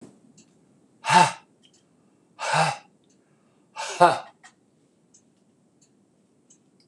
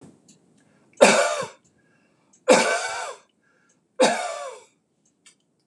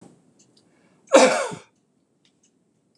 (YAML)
exhalation_length: 6.9 s
exhalation_amplitude: 25956
exhalation_signal_mean_std_ratio: 0.26
three_cough_length: 5.7 s
three_cough_amplitude: 26028
three_cough_signal_mean_std_ratio: 0.35
cough_length: 3.0 s
cough_amplitude: 26027
cough_signal_mean_std_ratio: 0.26
survey_phase: beta (2021-08-13 to 2022-03-07)
age: 65+
gender: Male
wearing_mask: 'No'
symptom_runny_or_blocked_nose: true
smoker_status: Never smoked
respiratory_condition_asthma: false
respiratory_condition_other: false
recruitment_source: Test and Trace
submission_delay: 3 days
covid_test_result: Negative
covid_test_method: RT-qPCR